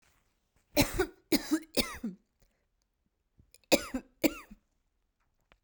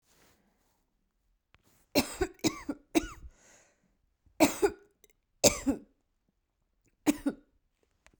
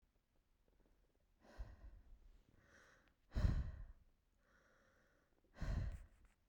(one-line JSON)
{"cough_length": "5.6 s", "cough_amplitude": 10901, "cough_signal_mean_std_ratio": 0.3, "three_cough_length": "8.2 s", "three_cough_amplitude": 17411, "three_cough_signal_mean_std_ratio": 0.26, "exhalation_length": "6.5 s", "exhalation_amplitude": 1772, "exhalation_signal_mean_std_ratio": 0.34, "survey_phase": "beta (2021-08-13 to 2022-03-07)", "age": "18-44", "gender": "Female", "wearing_mask": "No", "symptom_none": true, "smoker_status": "Ex-smoker", "respiratory_condition_asthma": false, "respiratory_condition_other": false, "recruitment_source": "REACT", "submission_delay": "1 day", "covid_test_result": "Negative", "covid_test_method": "RT-qPCR", "influenza_a_test_result": "Unknown/Void", "influenza_b_test_result": "Unknown/Void"}